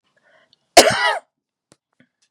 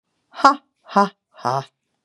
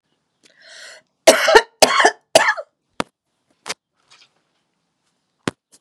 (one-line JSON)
{"cough_length": "2.3 s", "cough_amplitude": 32768, "cough_signal_mean_std_ratio": 0.27, "exhalation_length": "2.0 s", "exhalation_amplitude": 32767, "exhalation_signal_mean_std_ratio": 0.31, "three_cough_length": "5.8 s", "three_cough_amplitude": 32768, "three_cough_signal_mean_std_ratio": 0.28, "survey_phase": "beta (2021-08-13 to 2022-03-07)", "age": "65+", "gender": "Female", "wearing_mask": "No", "symptom_cough_any": true, "symptom_shortness_of_breath": true, "symptom_onset": "12 days", "smoker_status": "Never smoked", "respiratory_condition_asthma": true, "respiratory_condition_other": false, "recruitment_source": "REACT", "submission_delay": "1 day", "covid_test_result": "Negative", "covid_test_method": "RT-qPCR", "influenza_a_test_result": "Unknown/Void", "influenza_b_test_result": "Unknown/Void"}